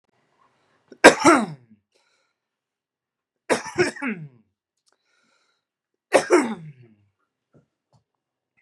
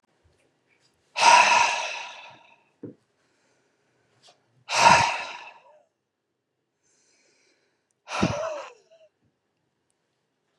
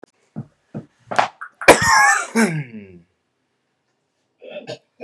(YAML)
three_cough_length: 8.6 s
three_cough_amplitude: 32768
three_cough_signal_mean_std_ratio: 0.24
exhalation_length: 10.6 s
exhalation_amplitude: 24404
exhalation_signal_mean_std_ratio: 0.3
cough_length: 5.0 s
cough_amplitude: 32768
cough_signal_mean_std_ratio: 0.35
survey_phase: beta (2021-08-13 to 2022-03-07)
age: 45-64
gender: Male
wearing_mask: 'No'
symptom_none: true
symptom_onset: 6 days
smoker_status: Current smoker (11 or more cigarettes per day)
respiratory_condition_asthma: false
respiratory_condition_other: false
recruitment_source: REACT
submission_delay: 33 days
covid_test_result: Negative
covid_test_method: RT-qPCR
influenza_a_test_result: Unknown/Void
influenza_b_test_result: Unknown/Void